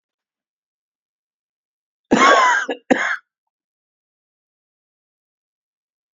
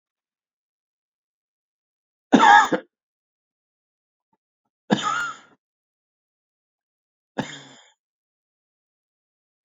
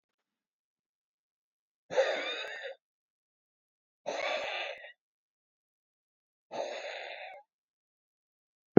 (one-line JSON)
{"cough_length": "6.1 s", "cough_amplitude": 27995, "cough_signal_mean_std_ratio": 0.28, "three_cough_length": "9.6 s", "three_cough_amplitude": 27255, "three_cough_signal_mean_std_ratio": 0.2, "exhalation_length": "8.8 s", "exhalation_amplitude": 20848, "exhalation_signal_mean_std_ratio": 0.27, "survey_phase": "beta (2021-08-13 to 2022-03-07)", "age": "45-64", "gender": "Male", "wearing_mask": "No", "symptom_cough_any": true, "symptom_sore_throat": true, "symptom_diarrhoea": true, "symptom_fatigue": true, "symptom_headache": true, "symptom_change_to_sense_of_smell_or_taste": true, "symptom_loss_of_taste": true, "symptom_onset": "2 days", "smoker_status": "Current smoker (e-cigarettes or vapes only)", "respiratory_condition_asthma": false, "respiratory_condition_other": false, "recruitment_source": "Test and Trace", "submission_delay": "1 day", "covid_test_result": "Positive", "covid_test_method": "RT-qPCR", "covid_ct_value": 26.0, "covid_ct_gene": "ORF1ab gene", "covid_ct_mean": 26.2, "covid_viral_load": "2500 copies/ml", "covid_viral_load_category": "Minimal viral load (< 10K copies/ml)"}